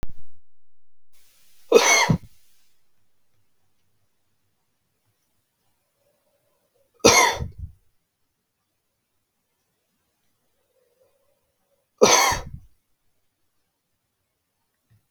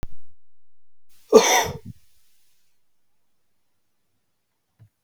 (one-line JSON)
{"three_cough_length": "15.1 s", "three_cough_amplitude": 32735, "three_cough_signal_mean_std_ratio": 0.27, "cough_length": "5.0 s", "cough_amplitude": 32768, "cough_signal_mean_std_ratio": 0.31, "survey_phase": "beta (2021-08-13 to 2022-03-07)", "age": "18-44", "gender": "Male", "wearing_mask": "No", "symptom_cough_any": true, "smoker_status": "Never smoked", "respiratory_condition_asthma": true, "respiratory_condition_other": false, "recruitment_source": "REACT", "submission_delay": "1 day", "covid_test_result": "Negative", "covid_test_method": "RT-qPCR", "influenza_a_test_result": "Negative", "influenza_b_test_result": "Negative"}